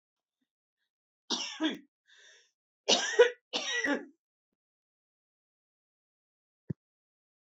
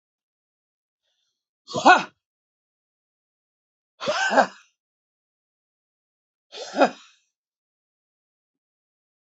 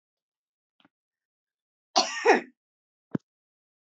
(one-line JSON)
{"three_cough_length": "7.5 s", "three_cough_amplitude": 10125, "three_cough_signal_mean_std_ratio": 0.27, "exhalation_length": "9.3 s", "exhalation_amplitude": 27574, "exhalation_signal_mean_std_ratio": 0.2, "cough_length": "3.9 s", "cough_amplitude": 16135, "cough_signal_mean_std_ratio": 0.22, "survey_phase": "beta (2021-08-13 to 2022-03-07)", "age": "65+", "gender": "Female", "wearing_mask": "No", "symptom_cough_any": true, "symptom_runny_or_blocked_nose": true, "symptom_fatigue": true, "smoker_status": "Never smoked", "respiratory_condition_asthma": true, "respiratory_condition_other": false, "recruitment_source": "REACT", "submission_delay": "8 days", "covid_test_result": "Negative", "covid_test_method": "RT-qPCR", "influenza_a_test_result": "Negative", "influenza_b_test_result": "Negative"}